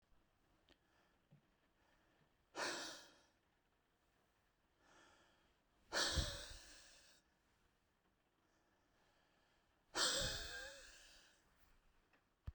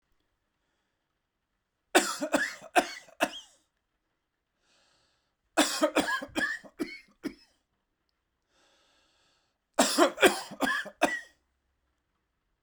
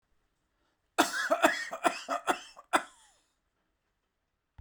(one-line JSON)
{"exhalation_length": "12.5 s", "exhalation_amplitude": 1818, "exhalation_signal_mean_std_ratio": 0.32, "three_cough_length": "12.6 s", "three_cough_amplitude": 17562, "three_cough_signal_mean_std_ratio": 0.32, "cough_length": "4.6 s", "cough_amplitude": 12864, "cough_signal_mean_std_ratio": 0.35, "survey_phase": "beta (2021-08-13 to 2022-03-07)", "age": "45-64", "gender": "Male", "wearing_mask": "No", "symptom_none": true, "smoker_status": "Ex-smoker", "respiratory_condition_asthma": false, "respiratory_condition_other": false, "recruitment_source": "REACT", "submission_delay": "2 days", "covid_test_result": "Negative", "covid_test_method": "RT-qPCR"}